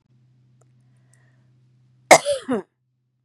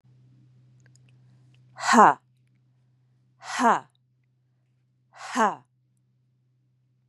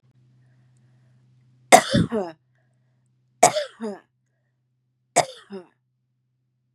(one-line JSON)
{"cough_length": "3.2 s", "cough_amplitude": 32768, "cough_signal_mean_std_ratio": 0.2, "exhalation_length": "7.1 s", "exhalation_amplitude": 27699, "exhalation_signal_mean_std_ratio": 0.24, "three_cough_length": "6.7 s", "three_cough_amplitude": 32768, "three_cough_signal_mean_std_ratio": 0.23, "survey_phase": "beta (2021-08-13 to 2022-03-07)", "age": "45-64", "gender": "Female", "wearing_mask": "No", "symptom_none": true, "smoker_status": "Never smoked", "respiratory_condition_asthma": false, "respiratory_condition_other": false, "recruitment_source": "Test and Trace", "submission_delay": "1 day", "covid_test_result": "Negative", "covid_test_method": "RT-qPCR"}